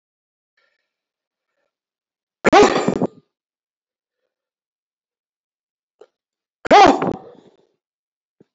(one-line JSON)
{"cough_length": "8.5 s", "cough_amplitude": 28620, "cough_signal_mean_std_ratio": 0.24, "survey_phase": "alpha (2021-03-01 to 2021-08-12)", "age": "65+", "gender": "Male", "wearing_mask": "No", "symptom_none": true, "smoker_status": "Ex-smoker", "respiratory_condition_asthma": false, "respiratory_condition_other": false, "recruitment_source": "REACT", "submission_delay": "1 day", "covid_test_result": "Negative", "covid_test_method": "RT-qPCR"}